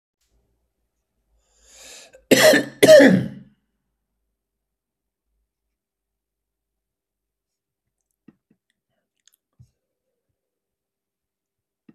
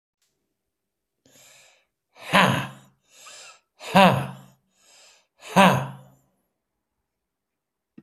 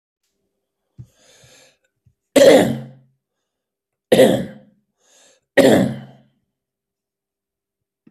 {"cough_length": "11.9 s", "cough_amplitude": 32768, "cough_signal_mean_std_ratio": 0.2, "exhalation_length": "8.0 s", "exhalation_amplitude": 30485, "exhalation_signal_mean_std_ratio": 0.27, "three_cough_length": "8.1 s", "three_cough_amplitude": 30803, "three_cough_signal_mean_std_ratio": 0.29, "survey_phase": "alpha (2021-03-01 to 2021-08-12)", "age": "65+", "gender": "Male", "wearing_mask": "No", "symptom_none": true, "smoker_status": "Never smoked", "respiratory_condition_asthma": true, "respiratory_condition_other": false, "recruitment_source": "REACT", "submission_delay": "1 day", "covid_test_result": "Negative", "covid_test_method": "RT-qPCR"}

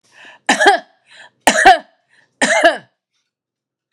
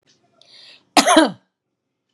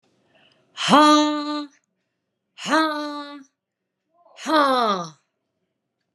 {"three_cough_length": "3.9 s", "three_cough_amplitude": 32768, "three_cough_signal_mean_std_ratio": 0.37, "cough_length": "2.1 s", "cough_amplitude": 32767, "cough_signal_mean_std_ratio": 0.3, "exhalation_length": "6.1 s", "exhalation_amplitude": 31583, "exhalation_signal_mean_std_ratio": 0.41, "survey_phase": "beta (2021-08-13 to 2022-03-07)", "age": "45-64", "gender": "Female", "wearing_mask": "No", "symptom_none": true, "smoker_status": "Never smoked", "respiratory_condition_asthma": false, "respiratory_condition_other": false, "recruitment_source": "REACT", "submission_delay": "5 days", "covid_test_result": "Negative", "covid_test_method": "RT-qPCR"}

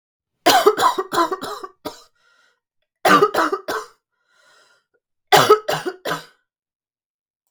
{"three_cough_length": "7.5 s", "three_cough_amplitude": 32768, "three_cough_signal_mean_std_ratio": 0.38, "survey_phase": "beta (2021-08-13 to 2022-03-07)", "age": "18-44", "gender": "Female", "wearing_mask": "No", "symptom_cough_any": true, "symptom_fatigue": true, "symptom_onset": "12 days", "smoker_status": "Never smoked", "respiratory_condition_asthma": false, "respiratory_condition_other": false, "recruitment_source": "REACT", "submission_delay": "3 days", "covid_test_result": "Negative", "covid_test_method": "RT-qPCR", "influenza_a_test_result": "Unknown/Void", "influenza_b_test_result": "Unknown/Void"}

